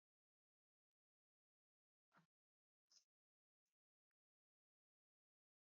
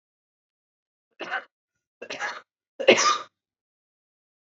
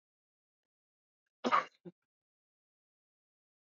exhalation_length: 5.6 s
exhalation_amplitude: 39
exhalation_signal_mean_std_ratio: 0.15
three_cough_length: 4.4 s
three_cough_amplitude: 26416
three_cough_signal_mean_std_ratio: 0.26
cough_length: 3.7 s
cough_amplitude: 5703
cough_signal_mean_std_ratio: 0.17
survey_phase: beta (2021-08-13 to 2022-03-07)
age: 18-44
gender: Female
wearing_mask: 'No'
symptom_cough_any: true
symptom_runny_or_blocked_nose: true
symptom_onset: 12 days
smoker_status: Never smoked
respiratory_condition_asthma: false
respiratory_condition_other: false
recruitment_source: REACT
submission_delay: 3 days
covid_test_result: Negative
covid_test_method: RT-qPCR
influenza_a_test_result: Negative
influenza_b_test_result: Negative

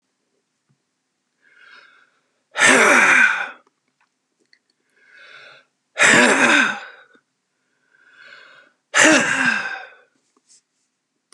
exhalation_length: 11.3 s
exhalation_amplitude: 32523
exhalation_signal_mean_std_ratio: 0.38
survey_phase: beta (2021-08-13 to 2022-03-07)
age: 65+
gender: Male
wearing_mask: 'No'
symptom_other: true
symptom_onset: 12 days
smoker_status: Ex-smoker
respiratory_condition_asthma: false
respiratory_condition_other: false
recruitment_source: REACT
submission_delay: 0 days
covid_test_result: Negative
covid_test_method: RT-qPCR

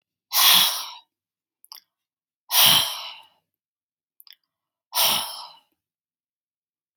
exhalation_length: 7.0 s
exhalation_amplitude: 26376
exhalation_signal_mean_std_ratio: 0.34
survey_phase: beta (2021-08-13 to 2022-03-07)
age: 65+
gender: Female
wearing_mask: 'No'
symptom_none: true
smoker_status: Prefer not to say
respiratory_condition_asthma: false
respiratory_condition_other: false
recruitment_source: REACT
submission_delay: 3 days
covid_test_result: Negative
covid_test_method: RT-qPCR
influenza_a_test_result: Negative
influenza_b_test_result: Negative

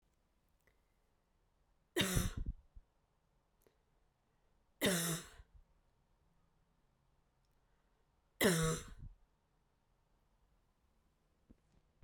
three_cough_length: 12.0 s
three_cough_amplitude: 3985
three_cough_signal_mean_std_ratio: 0.28
survey_phase: beta (2021-08-13 to 2022-03-07)
age: 18-44
gender: Female
wearing_mask: 'No'
symptom_cough_any: true
symptom_runny_or_blocked_nose: true
symptom_sore_throat: true
symptom_fatigue: true
symptom_headache: true
symptom_change_to_sense_of_smell_or_taste: true
smoker_status: Never smoked
respiratory_condition_asthma: false
respiratory_condition_other: false
recruitment_source: Test and Trace
submission_delay: 2 days
covid_test_result: Positive
covid_test_method: RT-qPCR
covid_ct_value: 15.1
covid_ct_gene: ORF1ab gene
covid_ct_mean: 15.5
covid_viral_load: 8100000 copies/ml
covid_viral_load_category: High viral load (>1M copies/ml)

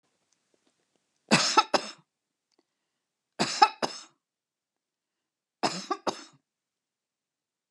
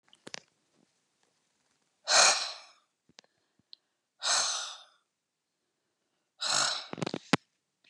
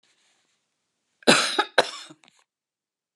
three_cough_length: 7.7 s
three_cough_amplitude: 24643
three_cough_signal_mean_std_ratio: 0.24
exhalation_length: 7.9 s
exhalation_amplitude: 18608
exhalation_signal_mean_std_ratio: 0.31
cough_length: 3.2 s
cough_amplitude: 27670
cough_signal_mean_std_ratio: 0.26
survey_phase: beta (2021-08-13 to 2022-03-07)
age: 65+
gender: Female
wearing_mask: 'No'
symptom_none: true
smoker_status: Never smoked
respiratory_condition_asthma: false
respiratory_condition_other: false
recruitment_source: REACT
submission_delay: 2 days
covid_test_result: Negative
covid_test_method: RT-qPCR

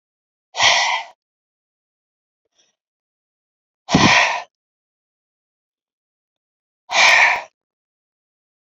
exhalation_length: 8.6 s
exhalation_amplitude: 32054
exhalation_signal_mean_std_ratio: 0.32
survey_phase: alpha (2021-03-01 to 2021-08-12)
age: 45-64
gender: Female
wearing_mask: 'No'
symptom_none: true
smoker_status: Ex-smoker
respiratory_condition_asthma: false
respiratory_condition_other: false
recruitment_source: REACT
submission_delay: 1 day
covid_test_result: Negative
covid_test_method: RT-qPCR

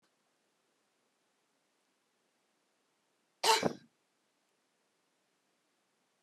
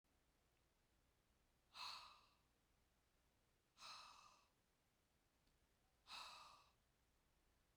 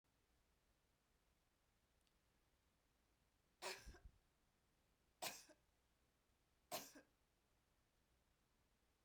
cough_length: 6.2 s
cough_amplitude: 6692
cough_signal_mean_std_ratio: 0.16
exhalation_length: 7.8 s
exhalation_amplitude: 249
exhalation_signal_mean_std_ratio: 0.43
three_cough_length: 9.0 s
three_cough_amplitude: 686
three_cough_signal_mean_std_ratio: 0.28
survey_phase: beta (2021-08-13 to 2022-03-07)
age: 65+
gender: Female
wearing_mask: 'No'
symptom_none: true
smoker_status: Ex-smoker
respiratory_condition_asthma: false
respiratory_condition_other: false
recruitment_source: REACT
submission_delay: 1 day
covid_test_result: Negative
covid_test_method: RT-qPCR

